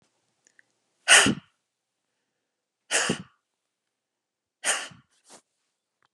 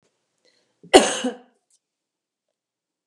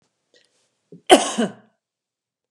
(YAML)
exhalation_length: 6.1 s
exhalation_amplitude: 27997
exhalation_signal_mean_std_ratio: 0.23
cough_length: 3.1 s
cough_amplitude: 32768
cough_signal_mean_std_ratio: 0.2
three_cough_length: 2.5 s
three_cough_amplitude: 32768
three_cough_signal_mean_std_ratio: 0.23
survey_phase: beta (2021-08-13 to 2022-03-07)
age: 45-64
gender: Female
wearing_mask: 'No'
symptom_none: true
smoker_status: Never smoked
respiratory_condition_asthma: false
respiratory_condition_other: false
recruitment_source: Test and Trace
submission_delay: 0 days
covid_test_result: Negative
covid_test_method: LFT